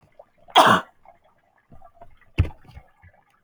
{"cough_length": "3.4 s", "cough_amplitude": 30782, "cough_signal_mean_std_ratio": 0.27, "survey_phase": "alpha (2021-03-01 to 2021-08-12)", "age": "18-44", "gender": "Female", "wearing_mask": "No", "symptom_headache": true, "smoker_status": "Never smoked", "respiratory_condition_asthma": false, "respiratory_condition_other": false, "recruitment_source": "Test and Trace", "submission_delay": "1 day", "covid_test_result": "Positive", "covid_test_method": "RT-qPCR", "covid_ct_value": 18.5, "covid_ct_gene": "ORF1ab gene", "covid_ct_mean": 19.3, "covid_viral_load": "460000 copies/ml", "covid_viral_load_category": "Low viral load (10K-1M copies/ml)"}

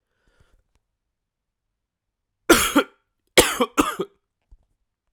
{"cough_length": "5.1 s", "cough_amplitude": 32768, "cough_signal_mean_std_ratio": 0.26, "survey_phase": "beta (2021-08-13 to 2022-03-07)", "age": "18-44", "gender": "Male", "wearing_mask": "No", "symptom_cough_any": true, "symptom_runny_or_blocked_nose": true, "symptom_shortness_of_breath": true, "symptom_sore_throat": true, "symptom_abdominal_pain": true, "symptom_fatigue": true, "symptom_fever_high_temperature": true, "symptom_headache": true, "symptom_change_to_sense_of_smell_or_taste": true, "symptom_onset": "3 days", "smoker_status": "Ex-smoker", "respiratory_condition_asthma": false, "respiratory_condition_other": false, "recruitment_source": "Test and Trace", "submission_delay": "2 days", "covid_test_result": "Positive", "covid_test_method": "RT-qPCR", "covid_ct_value": 15.8, "covid_ct_gene": "ORF1ab gene", "covid_ct_mean": 16.3, "covid_viral_load": "4600000 copies/ml", "covid_viral_load_category": "High viral load (>1M copies/ml)"}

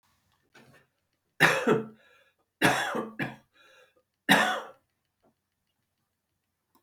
{"three_cough_length": "6.8 s", "three_cough_amplitude": 21220, "three_cough_signal_mean_std_ratio": 0.32, "survey_phase": "beta (2021-08-13 to 2022-03-07)", "age": "65+", "gender": "Male", "wearing_mask": "No", "symptom_none": true, "symptom_onset": "3 days", "smoker_status": "Never smoked", "respiratory_condition_asthma": false, "respiratory_condition_other": false, "recruitment_source": "REACT", "submission_delay": "2 days", "covid_test_result": "Negative", "covid_test_method": "RT-qPCR", "influenza_a_test_result": "Negative", "influenza_b_test_result": "Negative"}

